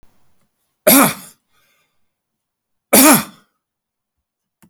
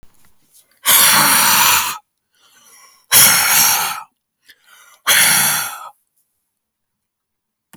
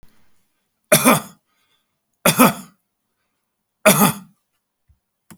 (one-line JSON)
{"cough_length": "4.7 s", "cough_amplitude": 32768, "cough_signal_mean_std_ratio": 0.29, "exhalation_length": "7.8 s", "exhalation_amplitude": 32768, "exhalation_signal_mean_std_ratio": 0.49, "three_cough_length": "5.4 s", "three_cough_amplitude": 32768, "three_cough_signal_mean_std_ratio": 0.3, "survey_phase": "beta (2021-08-13 to 2022-03-07)", "age": "45-64", "gender": "Male", "wearing_mask": "No", "symptom_none": true, "smoker_status": "Never smoked", "respiratory_condition_asthma": false, "respiratory_condition_other": false, "recruitment_source": "REACT", "submission_delay": "3 days", "covid_test_result": "Negative", "covid_test_method": "RT-qPCR", "influenza_a_test_result": "Negative", "influenza_b_test_result": "Negative"}